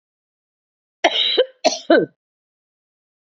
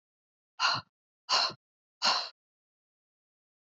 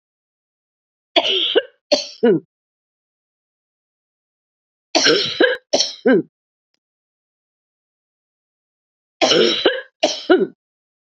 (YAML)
cough_length: 3.2 s
cough_amplitude: 29854
cough_signal_mean_std_ratio: 0.34
exhalation_length: 3.7 s
exhalation_amplitude: 7365
exhalation_signal_mean_std_ratio: 0.33
three_cough_length: 11.1 s
three_cough_amplitude: 31208
three_cough_signal_mean_std_ratio: 0.37
survey_phase: beta (2021-08-13 to 2022-03-07)
age: 45-64
gender: Female
wearing_mask: 'No'
symptom_cough_any: true
symptom_runny_or_blocked_nose: true
symptom_shortness_of_breath: true
symptom_fatigue: true
symptom_onset: 3 days
smoker_status: Never smoked
respiratory_condition_asthma: true
respiratory_condition_other: false
recruitment_source: Test and Trace
submission_delay: 1 day
covid_test_result: Positive
covid_test_method: RT-qPCR
covid_ct_value: 23.6
covid_ct_gene: N gene